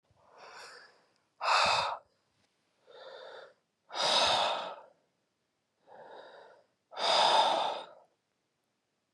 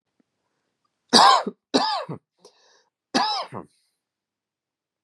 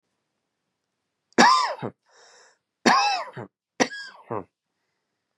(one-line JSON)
{"exhalation_length": "9.1 s", "exhalation_amplitude": 6933, "exhalation_signal_mean_std_ratio": 0.42, "cough_length": "5.0 s", "cough_amplitude": 31890, "cough_signal_mean_std_ratio": 0.31, "three_cough_length": "5.4 s", "three_cough_amplitude": 31237, "three_cough_signal_mean_std_ratio": 0.33, "survey_phase": "beta (2021-08-13 to 2022-03-07)", "age": "18-44", "gender": "Male", "wearing_mask": "No", "symptom_runny_or_blocked_nose": true, "symptom_onset": "3 days", "smoker_status": "Never smoked", "respiratory_condition_asthma": false, "respiratory_condition_other": false, "recruitment_source": "Test and Trace", "submission_delay": "2 days", "covid_test_result": "Negative", "covid_test_method": "ePCR"}